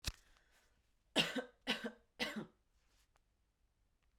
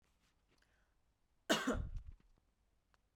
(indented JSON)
{
  "three_cough_length": "4.2 s",
  "three_cough_amplitude": 4113,
  "three_cough_signal_mean_std_ratio": 0.32,
  "cough_length": "3.2 s",
  "cough_amplitude": 3412,
  "cough_signal_mean_std_ratio": 0.32,
  "survey_phase": "beta (2021-08-13 to 2022-03-07)",
  "age": "18-44",
  "gender": "Female",
  "wearing_mask": "No",
  "symptom_none": true,
  "smoker_status": "Never smoked",
  "respiratory_condition_asthma": false,
  "respiratory_condition_other": false,
  "recruitment_source": "REACT",
  "submission_delay": "4 days",
  "covid_test_result": "Negative",
  "covid_test_method": "RT-qPCR",
  "influenza_a_test_result": "Negative",
  "influenza_b_test_result": "Negative"
}